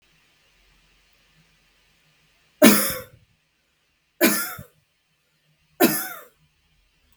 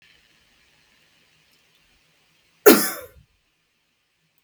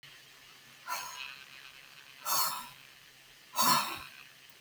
{"three_cough_length": "7.2 s", "three_cough_amplitude": 32768, "three_cough_signal_mean_std_ratio": 0.25, "cough_length": "4.4 s", "cough_amplitude": 32768, "cough_signal_mean_std_ratio": 0.17, "exhalation_length": "4.6 s", "exhalation_amplitude": 7170, "exhalation_signal_mean_std_ratio": 0.44, "survey_phase": "beta (2021-08-13 to 2022-03-07)", "age": "18-44", "gender": "Female", "wearing_mask": "No", "symptom_none": true, "smoker_status": "Never smoked", "respiratory_condition_asthma": false, "respiratory_condition_other": false, "recruitment_source": "REACT", "submission_delay": "1 day", "covid_test_result": "Negative", "covid_test_method": "RT-qPCR", "influenza_a_test_result": "Negative", "influenza_b_test_result": "Negative"}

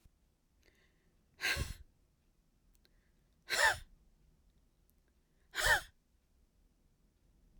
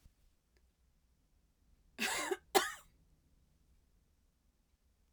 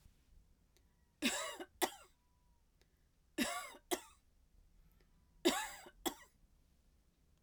{"exhalation_length": "7.6 s", "exhalation_amplitude": 5649, "exhalation_signal_mean_std_ratio": 0.27, "cough_length": "5.1 s", "cough_amplitude": 6552, "cough_signal_mean_std_ratio": 0.25, "three_cough_length": "7.4 s", "three_cough_amplitude": 3945, "three_cough_signal_mean_std_ratio": 0.32, "survey_phase": "alpha (2021-03-01 to 2021-08-12)", "age": "45-64", "gender": "Female", "wearing_mask": "No", "symptom_none": true, "smoker_status": "Never smoked", "respiratory_condition_asthma": true, "respiratory_condition_other": false, "recruitment_source": "REACT", "submission_delay": "1 day", "covid_test_result": "Negative", "covid_test_method": "RT-qPCR"}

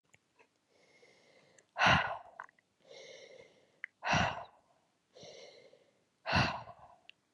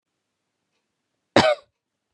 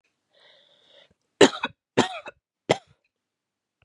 {"exhalation_length": "7.3 s", "exhalation_amplitude": 7097, "exhalation_signal_mean_std_ratio": 0.32, "cough_length": "2.1 s", "cough_amplitude": 29880, "cough_signal_mean_std_ratio": 0.23, "three_cough_length": "3.8 s", "three_cough_amplitude": 31573, "three_cough_signal_mean_std_ratio": 0.19, "survey_phase": "beta (2021-08-13 to 2022-03-07)", "age": "18-44", "gender": "Female", "wearing_mask": "No", "symptom_cough_any": true, "symptom_runny_or_blocked_nose": true, "smoker_status": "Never smoked", "respiratory_condition_asthma": false, "respiratory_condition_other": false, "recruitment_source": "Test and Trace", "submission_delay": "2 days", "covid_test_result": "Positive", "covid_test_method": "ePCR"}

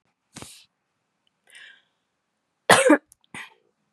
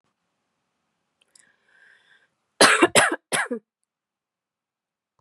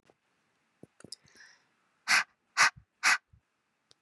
{"cough_length": "3.9 s", "cough_amplitude": 32767, "cough_signal_mean_std_ratio": 0.22, "three_cough_length": "5.2 s", "three_cough_amplitude": 32729, "three_cough_signal_mean_std_ratio": 0.25, "exhalation_length": "4.0 s", "exhalation_amplitude": 10809, "exhalation_signal_mean_std_ratio": 0.26, "survey_phase": "beta (2021-08-13 to 2022-03-07)", "age": "18-44", "gender": "Female", "wearing_mask": "No", "symptom_none": true, "smoker_status": "Ex-smoker", "respiratory_condition_asthma": false, "respiratory_condition_other": false, "recruitment_source": "REACT", "submission_delay": "1 day", "covid_test_result": "Negative", "covid_test_method": "RT-qPCR", "influenza_a_test_result": "Negative", "influenza_b_test_result": "Negative"}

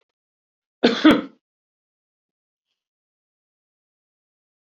{"cough_length": "4.6 s", "cough_amplitude": 26300, "cough_signal_mean_std_ratio": 0.19, "survey_phase": "beta (2021-08-13 to 2022-03-07)", "age": "65+", "gender": "Male", "wearing_mask": "No", "symptom_shortness_of_breath": true, "symptom_onset": "6 days", "smoker_status": "Ex-smoker", "respiratory_condition_asthma": false, "respiratory_condition_other": false, "recruitment_source": "REACT", "submission_delay": "0 days", "covid_test_result": "Negative", "covid_test_method": "RT-qPCR", "influenza_a_test_result": "Negative", "influenza_b_test_result": "Negative"}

